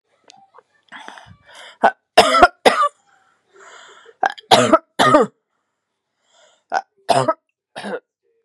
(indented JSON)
{
  "three_cough_length": "8.4 s",
  "three_cough_amplitude": 32768,
  "three_cough_signal_mean_std_ratio": 0.33,
  "survey_phase": "beta (2021-08-13 to 2022-03-07)",
  "age": "18-44",
  "gender": "Female",
  "wearing_mask": "No",
  "symptom_none": true,
  "smoker_status": "Ex-smoker",
  "respiratory_condition_asthma": false,
  "respiratory_condition_other": false,
  "recruitment_source": "REACT",
  "submission_delay": "8 days",
  "covid_test_result": "Negative",
  "covid_test_method": "RT-qPCR",
  "influenza_a_test_result": "Negative",
  "influenza_b_test_result": "Negative"
}